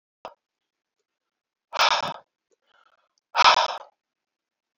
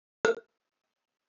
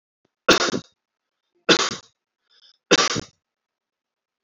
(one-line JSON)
{"exhalation_length": "4.8 s", "exhalation_amplitude": 24265, "exhalation_signal_mean_std_ratio": 0.27, "cough_length": "1.3 s", "cough_amplitude": 10100, "cough_signal_mean_std_ratio": 0.22, "three_cough_length": "4.4 s", "three_cough_amplitude": 31989, "three_cough_signal_mean_std_ratio": 0.29, "survey_phase": "beta (2021-08-13 to 2022-03-07)", "age": "45-64", "gender": "Male", "wearing_mask": "No", "symptom_cough_any": true, "symptom_runny_or_blocked_nose": true, "symptom_onset": "8 days", "smoker_status": "Never smoked", "respiratory_condition_asthma": false, "respiratory_condition_other": false, "recruitment_source": "Test and Trace", "submission_delay": "3 days", "covid_test_result": "Positive", "covid_test_method": "ePCR"}